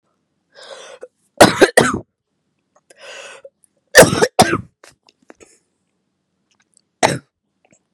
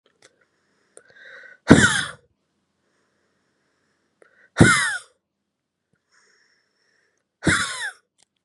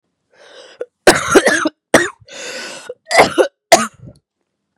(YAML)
three_cough_length: 7.9 s
three_cough_amplitude: 32768
three_cough_signal_mean_std_ratio: 0.26
exhalation_length: 8.4 s
exhalation_amplitude: 32768
exhalation_signal_mean_std_ratio: 0.25
cough_length: 4.8 s
cough_amplitude: 32768
cough_signal_mean_std_ratio: 0.39
survey_phase: beta (2021-08-13 to 2022-03-07)
age: 18-44
gender: Female
wearing_mask: 'No'
symptom_cough_any: true
symptom_runny_or_blocked_nose: true
symptom_sore_throat: true
symptom_fatigue: true
symptom_headache: true
symptom_change_to_sense_of_smell_or_taste: true
symptom_onset: 6 days
smoker_status: Never smoked
respiratory_condition_asthma: true
respiratory_condition_other: false
recruitment_source: Test and Trace
submission_delay: 2 days
covid_test_result: Positive
covid_test_method: ePCR